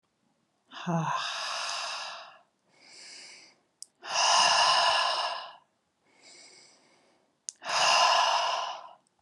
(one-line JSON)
{"exhalation_length": "9.2 s", "exhalation_amplitude": 9530, "exhalation_signal_mean_std_ratio": 0.53, "survey_phase": "alpha (2021-03-01 to 2021-08-12)", "age": "18-44", "gender": "Female", "wearing_mask": "No", "symptom_fatigue": true, "symptom_headache": true, "symptom_onset": "13 days", "smoker_status": "Never smoked", "respiratory_condition_asthma": false, "respiratory_condition_other": false, "recruitment_source": "REACT", "submission_delay": "1 day", "covid_test_result": "Negative", "covid_test_method": "RT-qPCR"}